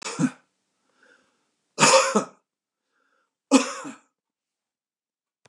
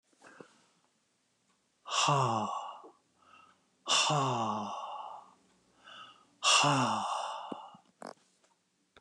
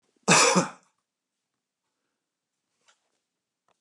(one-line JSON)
{"three_cough_length": "5.5 s", "three_cough_amplitude": 25003, "three_cough_signal_mean_std_ratio": 0.29, "exhalation_length": "9.0 s", "exhalation_amplitude": 8390, "exhalation_signal_mean_std_ratio": 0.48, "cough_length": "3.8 s", "cough_amplitude": 18186, "cough_signal_mean_std_ratio": 0.25, "survey_phase": "beta (2021-08-13 to 2022-03-07)", "age": "65+", "gender": "Male", "wearing_mask": "No", "symptom_none": true, "smoker_status": "Never smoked", "respiratory_condition_asthma": false, "respiratory_condition_other": false, "recruitment_source": "REACT", "submission_delay": "2 days", "covid_test_result": "Negative", "covid_test_method": "RT-qPCR", "influenza_a_test_result": "Negative", "influenza_b_test_result": "Negative"}